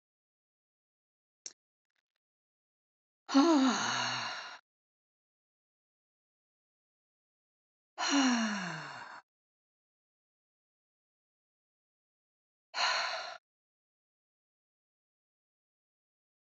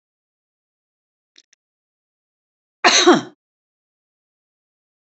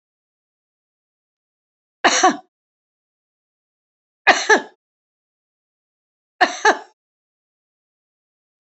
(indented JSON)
{
  "exhalation_length": "16.6 s",
  "exhalation_amplitude": 5600,
  "exhalation_signal_mean_std_ratio": 0.29,
  "cough_length": "5.0 s",
  "cough_amplitude": 32767,
  "cough_signal_mean_std_ratio": 0.21,
  "three_cough_length": "8.6 s",
  "three_cough_amplitude": 31316,
  "three_cough_signal_mean_std_ratio": 0.22,
  "survey_phase": "alpha (2021-03-01 to 2021-08-12)",
  "age": "65+",
  "gender": "Female",
  "wearing_mask": "No",
  "symptom_none": true,
  "smoker_status": "Never smoked",
  "respiratory_condition_asthma": false,
  "respiratory_condition_other": false,
  "recruitment_source": "REACT",
  "submission_delay": "2 days",
  "covid_test_result": "Negative",
  "covid_test_method": "RT-qPCR"
}